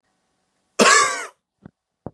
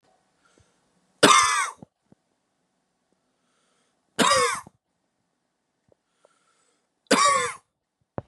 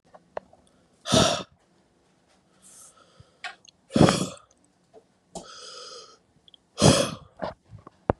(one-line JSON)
{"cough_length": "2.1 s", "cough_amplitude": 29449, "cough_signal_mean_std_ratio": 0.34, "three_cough_length": "8.3 s", "three_cough_amplitude": 29587, "three_cough_signal_mean_std_ratio": 0.3, "exhalation_length": "8.2 s", "exhalation_amplitude": 27768, "exhalation_signal_mean_std_ratio": 0.28, "survey_phase": "beta (2021-08-13 to 2022-03-07)", "age": "18-44", "gender": "Male", "wearing_mask": "No", "symptom_cough_any": true, "symptom_runny_or_blocked_nose": true, "symptom_shortness_of_breath": true, "symptom_sore_throat": true, "symptom_fatigue": true, "symptom_headache": true, "smoker_status": "Ex-smoker", "respiratory_condition_asthma": true, "respiratory_condition_other": false, "recruitment_source": "Test and Trace", "submission_delay": "2 days", "covid_test_result": "Positive", "covid_test_method": "RT-qPCR", "covid_ct_value": 24.7, "covid_ct_gene": "ORF1ab gene", "covid_ct_mean": 25.3, "covid_viral_load": "5000 copies/ml", "covid_viral_load_category": "Minimal viral load (< 10K copies/ml)"}